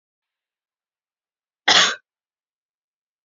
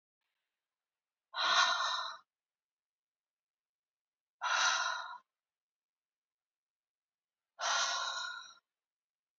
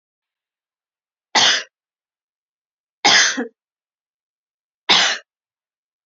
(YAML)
cough_length: 3.2 s
cough_amplitude: 29703
cough_signal_mean_std_ratio: 0.21
exhalation_length: 9.4 s
exhalation_amplitude: 5209
exhalation_signal_mean_std_ratio: 0.38
three_cough_length: 6.1 s
three_cough_amplitude: 32768
three_cough_signal_mean_std_ratio: 0.3
survey_phase: beta (2021-08-13 to 2022-03-07)
age: 18-44
gender: Female
wearing_mask: 'No'
symptom_cough_any: true
symptom_headache: true
symptom_onset: 3 days
smoker_status: Never smoked
respiratory_condition_asthma: false
respiratory_condition_other: false
recruitment_source: Test and Trace
submission_delay: 2 days
covid_test_result: Positive
covid_test_method: RT-qPCR
covid_ct_value: 21.4
covid_ct_gene: ORF1ab gene